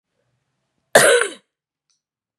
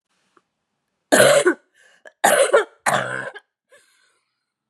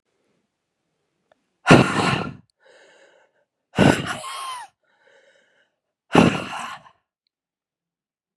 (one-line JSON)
{"cough_length": "2.4 s", "cough_amplitude": 32768, "cough_signal_mean_std_ratio": 0.28, "three_cough_length": "4.7 s", "three_cough_amplitude": 32487, "three_cough_signal_mean_std_ratio": 0.38, "exhalation_length": "8.4 s", "exhalation_amplitude": 32767, "exhalation_signal_mean_std_ratio": 0.29, "survey_phase": "beta (2021-08-13 to 2022-03-07)", "age": "45-64", "gender": "Female", "wearing_mask": "No", "symptom_cough_any": true, "symptom_runny_or_blocked_nose": true, "symptom_fatigue": true, "symptom_headache": true, "symptom_onset": "3 days", "smoker_status": "Never smoked", "respiratory_condition_asthma": false, "respiratory_condition_other": false, "recruitment_source": "Test and Trace", "submission_delay": "3 days", "covid_test_result": "Positive", "covid_test_method": "RT-qPCR", "covid_ct_value": 22.5, "covid_ct_gene": "N gene"}